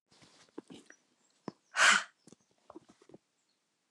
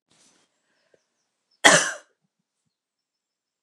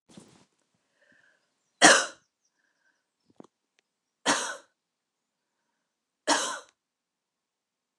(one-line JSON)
{"exhalation_length": "3.9 s", "exhalation_amplitude": 8734, "exhalation_signal_mean_std_ratio": 0.22, "cough_length": "3.6 s", "cough_amplitude": 29204, "cough_signal_mean_std_ratio": 0.19, "three_cough_length": "8.0 s", "three_cough_amplitude": 28835, "three_cough_signal_mean_std_ratio": 0.2, "survey_phase": "alpha (2021-03-01 to 2021-08-12)", "age": "45-64", "gender": "Female", "wearing_mask": "No", "symptom_none": true, "smoker_status": "Never smoked", "respiratory_condition_asthma": false, "respiratory_condition_other": false, "recruitment_source": "REACT", "submission_delay": "3 days", "covid_test_result": "Negative", "covid_test_method": "RT-qPCR"}